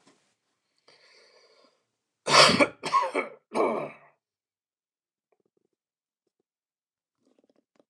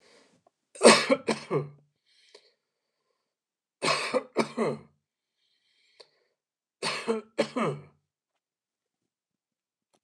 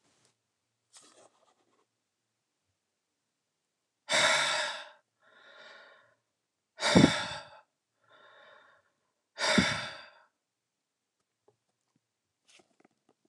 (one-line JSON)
{"cough_length": "7.9 s", "cough_amplitude": 20429, "cough_signal_mean_std_ratio": 0.26, "three_cough_length": "10.0 s", "three_cough_amplitude": 25537, "three_cough_signal_mean_std_ratio": 0.28, "exhalation_length": "13.3 s", "exhalation_amplitude": 14101, "exhalation_signal_mean_std_ratio": 0.26, "survey_phase": "beta (2021-08-13 to 2022-03-07)", "age": "65+", "gender": "Male", "wearing_mask": "No", "symptom_none": true, "smoker_status": "Ex-smoker", "respiratory_condition_asthma": false, "respiratory_condition_other": false, "recruitment_source": "REACT", "submission_delay": "3 days", "covid_test_result": "Negative", "covid_test_method": "RT-qPCR", "influenza_a_test_result": "Negative", "influenza_b_test_result": "Negative"}